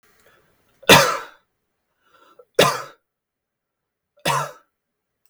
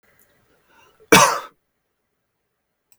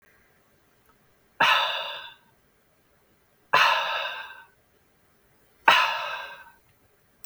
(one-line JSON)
{"three_cough_length": "5.3 s", "three_cough_amplitude": 32768, "three_cough_signal_mean_std_ratio": 0.26, "cough_length": "3.0 s", "cough_amplitude": 32768, "cough_signal_mean_std_ratio": 0.22, "exhalation_length": "7.3 s", "exhalation_amplitude": 29897, "exhalation_signal_mean_std_ratio": 0.36, "survey_phase": "beta (2021-08-13 to 2022-03-07)", "age": "18-44", "gender": "Male", "wearing_mask": "No", "symptom_none": true, "symptom_onset": "12 days", "smoker_status": "Never smoked", "respiratory_condition_asthma": false, "respiratory_condition_other": false, "recruitment_source": "REACT", "submission_delay": "1 day", "covid_test_result": "Negative", "covid_test_method": "RT-qPCR"}